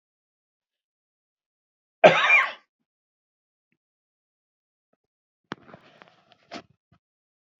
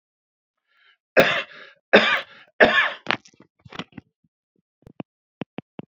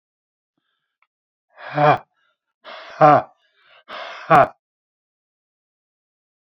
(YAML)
cough_length: 7.6 s
cough_amplitude: 27767
cough_signal_mean_std_ratio: 0.18
three_cough_length: 6.0 s
three_cough_amplitude: 31856
three_cough_signal_mean_std_ratio: 0.29
exhalation_length: 6.5 s
exhalation_amplitude: 28373
exhalation_signal_mean_std_ratio: 0.26
survey_phase: beta (2021-08-13 to 2022-03-07)
age: 65+
gender: Male
wearing_mask: 'No'
symptom_none: true
smoker_status: Ex-smoker
respiratory_condition_asthma: false
respiratory_condition_other: false
recruitment_source: REACT
submission_delay: 2 days
covid_test_result: Negative
covid_test_method: RT-qPCR
influenza_a_test_result: Negative
influenza_b_test_result: Negative